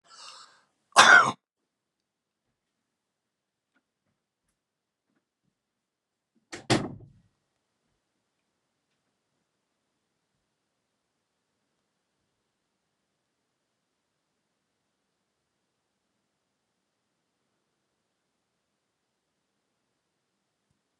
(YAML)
cough_length: 21.0 s
cough_amplitude: 27509
cough_signal_mean_std_ratio: 0.12
survey_phase: beta (2021-08-13 to 2022-03-07)
age: 65+
gender: Male
wearing_mask: 'No'
symptom_none: true
smoker_status: Never smoked
respiratory_condition_asthma: false
respiratory_condition_other: false
recruitment_source: REACT
submission_delay: 2 days
covid_test_result: Negative
covid_test_method: RT-qPCR
influenza_a_test_result: Negative
influenza_b_test_result: Negative